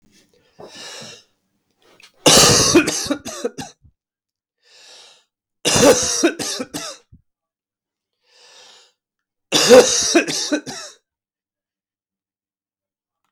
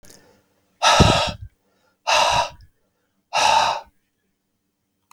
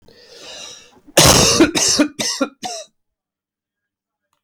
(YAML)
three_cough_length: 13.3 s
three_cough_amplitude: 32768
three_cough_signal_mean_std_ratio: 0.35
exhalation_length: 5.1 s
exhalation_amplitude: 32766
exhalation_signal_mean_std_ratio: 0.42
cough_length: 4.4 s
cough_amplitude: 32768
cough_signal_mean_std_ratio: 0.42
survey_phase: alpha (2021-03-01 to 2021-08-12)
age: 45-64
gender: Male
wearing_mask: 'Yes'
symptom_cough_any: true
symptom_new_continuous_cough: true
symptom_shortness_of_breath: true
symptom_fatigue: true
symptom_headache: true
symptom_onset: 3 days
smoker_status: Never smoked
respiratory_condition_asthma: false
respiratory_condition_other: false
recruitment_source: Test and Trace
submission_delay: 2 days
covid_test_result: Positive
covid_test_method: RT-qPCR